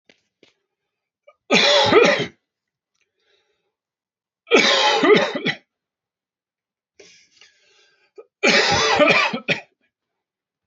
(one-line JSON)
{"three_cough_length": "10.7 s", "three_cough_amplitude": 27041, "three_cough_signal_mean_std_ratio": 0.41, "survey_phase": "beta (2021-08-13 to 2022-03-07)", "age": "45-64", "gender": "Male", "wearing_mask": "No", "symptom_cough_any": true, "symptom_new_continuous_cough": true, "symptom_runny_or_blocked_nose": true, "symptom_fatigue": true, "symptom_headache": true, "symptom_other": true, "smoker_status": "Never smoked", "respiratory_condition_asthma": false, "respiratory_condition_other": false, "recruitment_source": "Test and Trace", "submission_delay": "1 day", "covid_test_result": "Positive", "covid_test_method": "RT-qPCR"}